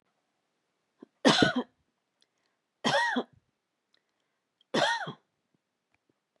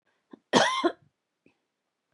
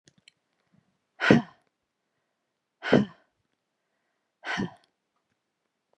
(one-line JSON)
{"three_cough_length": "6.4 s", "three_cough_amplitude": 14425, "three_cough_signal_mean_std_ratio": 0.31, "cough_length": "2.1 s", "cough_amplitude": 19767, "cough_signal_mean_std_ratio": 0.32, "exhalation_length": "6.0 s", "exhalation_amplitude": 26642, "exhalation_signal_mean_std_ratio": 0.21, "survey_phase": "beta (2021-08-13 to 2022-03-07)", "age": "45-64", "gender": "Female", "wearing_mask": "No", "symptom_none": true, "smoker_status": "Never smoked", "respiratory_condition_asthma": false, "respiratory_condition_other": false, "recruitment_source": "REACT", "submission_delay": "1 day", "covid_test_result": "Negative", "covid_test_method": "RT-qPCR", "influenza_a_test_result": "Negative", "influenza_b_test_result": "Negative"}